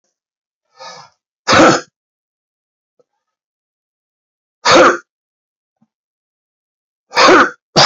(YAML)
exhalation_length: 7.9 s
exhalation_amplitude: 32768
exhalation_signal_mean_std_ratio: 0.31
survey_phase: alpha (2021-03-01 to 2021-08-12)
age: 45-64
gender: Male
wearing_mask: 'No'
symptom_cough_any: true
symptom_onset: 2 days
smoker_status: Never smoked
respiratory_condition_asthma: false
respiratory_condition_other: false
recruitment_source: Test and Trace
submission_delay: 2 days
covid_test_result: Positive
covid_test_method: RT-qPCR
covid_ct_value: 16.3
covid_ct_gene: ORF1ab gene
covid_ct_mean: 16.8
covid_viral_load: 3000000 copies/ml
covid_viral_load_category: High viral load (>1M copies/ml)